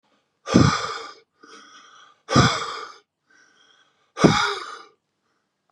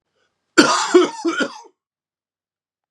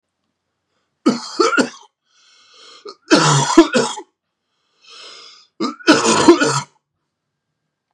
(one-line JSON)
{"exhalation_length": "5.7 s", "exhalation_amplitude": 32232, "exhalation_signal_mean_std_ratio": 0.35, "cough_length": "2.9 s", "cough_amplitude": 32768, "cough_signal_mean_std_ratio": 0.37, "three_cough_length": "7.9 s", "three_cough_amplitude": 32768, "three_cough_signal_mean_std_ratio": 0.39, "survey_phase": "beta (2021-08-13 to 2022-03-07)", "age": "45-64", "gender": "Male", "wearing_mask": "No", "symptom_cough_any": true, "symptom_runny_or_blocked_nose": true, "symptom_diarrhoea": true, "symptom_fatigue": true, "symptom_change_to_sense_of_smell_or_taste": true, "symptom_loss_of_taste": true, "symptom_onset": "4 days", "smoker_status": "Never smoked", "respiratory_condition_asthma": false, "respiratory_condition_other": false, "recruitment_source": "Test and Trace", "submission_delay": "2 days", "covid_test_result": "Positive", "covid_test_method": "RT-qPCR", "covid_ct_value": 15.1, "covid_ct_gene": "ORF1ab gene", "covid_ct_mean": 15.3, "covid_viral_load": "9900000 copies/ml", "covid_viral_load_category": "High viral load (>1M copies/ml)"}